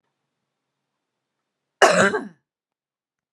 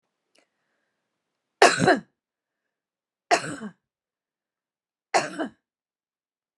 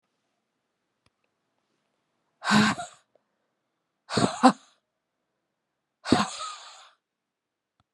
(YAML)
cough_length: 3.3 s
cough_amplitude: 30884
cough_signal_mean_std_ratio: 0.25
three_cough_length: 6.6 s
three_cough_amplitude: 29814
three_cough_signal_mean_std_ratio: 0.23
exhalation_length: 7.9 s
exhalation_amplitude: 26884
exhalation_signal_mean_std_ratio: 0.25
survey_phase: beta (2021-08-13 to 2022-03-07)
age: 45-64
gender: Female
wearing_mask: 'No'
symptom_runny_or_blocked_nose: true
symptom_sore_throat: true
symptom_abdominal_pain: true
symptom_fatigue: true
symptom_headache: true
smoker_status: Ex-smoker
respiratory_condition_asthma: false
respiratory_condition_other: false
recruitment_source: Test and Trace
submission_delay: 1 day
covid_test_result: Positive
covid_test_method: RT-qPCR
covid_ct_value: 33.7
covid_ct_gene: ORF1ab gene